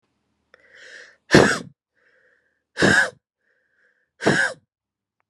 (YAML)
exhalation_length: 5.3 s
exhalation_amplitude: 32768
exhalation_signal_mean_std_ratio: 0.31
survey_phase: beta (2021-08-13 to 2022-03-07)
age: 45-64
gender: Female
wearing_mask: 'No'
symptom_runny_or_blocked_nose: true
symptom_shortness_of_breath: true
symptom_sore_throat: true
symptom_fatigue: true
symptom_fever_high_temperature: true
symptom_headache: true
smoker_status: Ex-smoker
respiratory_condition_asthma: true
respiratory_condition_other: false
recruitment_source: Test and Trace
submission_delay: 2 days
covid_test_result: Positive
covid_test_method: RT-qPCR